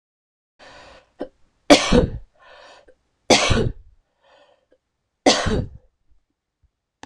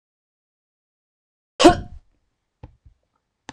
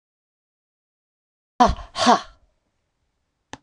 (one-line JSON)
{"three_cough_length": "7.1 s", "three_cough_amplitude": 26028, "three_cough_signal_mean_std_ratio": 0.31, "cough_length": "3.5 s", "cough_amplitude": 26028, "cough_signal_mean_std_ratio": 0.17, "exhalation_length": "3.6 s", "exhalation_amplitude": 25709, "exhalation_signal_mean_std_ratio": 0.24, "survey_phase": "beta (2021-08-13 to 2022-03-07)", "age": "45-64", "gender": "Female", "wearing_mask": "No", "symptom_cough_any": true, "symptom_runny_or_blocked_nose": true, "symptom_fatigue": true, "symptom_headache": true, "smoker_status": "Never smoked", "respiratory_condition_asthma": false, "respiratory_condition_other": false, "recruitment_source": "Test and Trace", "submission_delay": "3 days", "covid_test_result": "Positive", "covid_test_method": "RT-qPCR", "covid_ct_value": 29.5, "covid_ct_gene": "ORF1ab gene", "covid_ct_mean": 30.1, "covid_viral_load": "140 copies/ml", "covid_viral_load_category": "Minimal viral load (< 10K copies/ml)"}